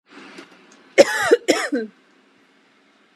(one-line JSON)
{"cough_length": "3.2 s", "cough_amplitude": 32768, "cough_signal_mean_std_ratio": 0.32, "survey_phase": "beta (2021-08-13 to 2022-03-07)", "age": "18-44", "gender": "Female", "wearing_mask": "No", "symptom_none": true, "smoker_status": "Never smoked", "respiratory_condition_asthma": true, "respiratory_condition_other": false, "recruitment_source": "REACT", "submission_delay": "0 days", "covid_test_result": "Negative", "covid_test_method": "RT-qPCR"}